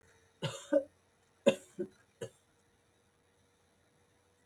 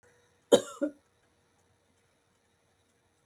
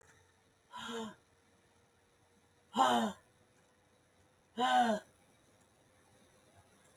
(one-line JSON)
{"three_cough_length": "4.5 s", "three_cough_amplitude": 9599, "three_cough_signal_mean_std_ratio": 0.22, "cough_length": "3.3 s", "cough_amplitude": 15759, "cough_signal_mean_std_ratio": 0.16, "exhalation_length": "7.0 s", "exhalation_amplitude": 5325, "exhalation_signal_mean_std_ratio": 0.32, "survey_phase": "beta (2021-08-13 to 2022-03-07)", "age": "65+", "gender": "Female", "wearing_mask": "No", "symptom_fatigue": true, "smoker_status": "Never smoked", "respiratory_condition_asthma": false, "respiratory_condition_other": false, "recruitment_source": "REACT", "submission_delay": "1 day", "covid_test_result": "Negative", "covid_test_method": "RT-qPCR", "influenza_a_test_result": "Negative", "influenza_b_test_result": "Negative"}